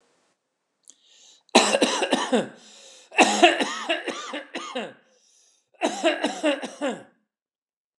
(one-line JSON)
{"cough_length": "8.0 s", "cough_amplitude": 28608, "cough_signal_mean_std_ratio": 0.43, "survey_phase": "beta (2021-08-13 to 2022-03-07)", "age": "65+", "gender": "Male", "wearing_mask": "No", "symptom_fatigue": true, "smoker_status": "Ex-smoker", "respiratory_condition_asthma": false, "respiratory_condition_other": false, "recruitment_source": "REACT", "submission_delay": "2 days", "covid_test_result": "Negative", "covid_test_method": "RT-qPCR"}